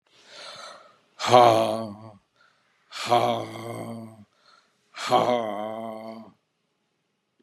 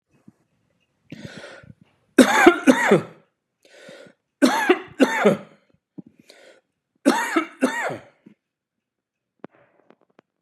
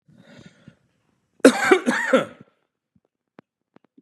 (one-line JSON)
{"exhalation_length": "7.4 s", "exhalation_amplitude": 27438, "exhalation_signal_mean_std_ratio": 0.37, "three_cough_length": "10.4 s", "three_cough_amplitude": 32768, "three_cough_signal_mean_std_ratio": 0.33, "cough_length": "4.0 s", "cough_amplitude": 32767, "cough_signal_mean_std_ratio": 0.29, "survey_phase": "beta (2021-08-13 to 2022-03-07)", "age": "65+", "gender": "Male", "wearing_mask": "No", "symptom_none": true, "smoker_status": "Never smoked", "respiratory_condition_asthma": false, "respiratory_condition_other": false, "recruitment_source": "REACT", "submission_delay": "0 days", "covid_test_result": "Negative", "covid_test_method": "RT-qPCR", "influenza_a_test_result": "Negative", "influenza_b_test_result": "Negative"}